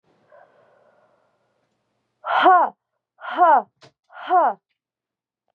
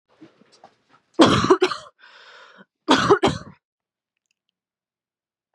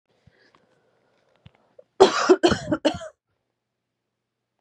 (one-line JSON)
{"exhalation_length": "5.5 s", "exhalation_amplitude": 23570, "exhalation_signal_mean_std_ratio": 0.34, "cough_length": "5.5 s", "cough_amplitude": 32498, "cough_signal_mean_std_ratio": 0.31, "three_cough_length": "4.6 s", "three_cough_amplitude": 32767, "three_cough_signal_mean_std_ratio": 0.27, "survey_phase": "beta (2021-08-13 to 2022-03-07)", "age": "18-44", "gender": "Female", "wearing_mask": "No", "symptom_cough_any": true, "symptom_onset": "12 days", "smoker_status": "Prefer not to say", "respiratory_condition_asthma": false, "respiratory_condition_other": false, "recruitment_source": "REACT", "submission_delay": "0 days", "covid_test_result": "Negative", "covid_test_method": "RT-qPCR", "influenza_a_test_result": "Negative", "influenza_b_test_result": "Negative"}